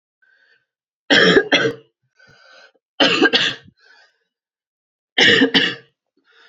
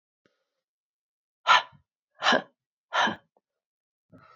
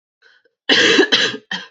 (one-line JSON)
{"three_cough_length": "6.5 s", "three_cough_amplitude": 31109, "three_cough_signal_mean_std_ratio": 0.4, "exhalation_length": "4.4 s", "exhalation_amplitude": 15925, "exhalation_signal_mean_std_ratio": 0.26, "cough_length": "1.7 s", "cough_amplitude": 29178, "cough_signal_mean_std_ratio": 0.54, "survey_phase": "beta (2021-08-13 to 2022-03-07)", "age": "18-44", "gender": "Female", "wearing_mask": "No", "symptom_cough_any": true, "symptom_runny_or_blocked_nose": true, "symptom_sore_throat": true, "symptom_other": true, "symptom_onset": "4 days", "smoker_status": "Never smoked", "respiratory_condition_asthma": false, "respiratory_condition_other": false, "recruitment_source": "Test and Trace", "submission_delay": "1 day", "covid_test_result": "Negative", "covid_test_method": "RT-qPCR"}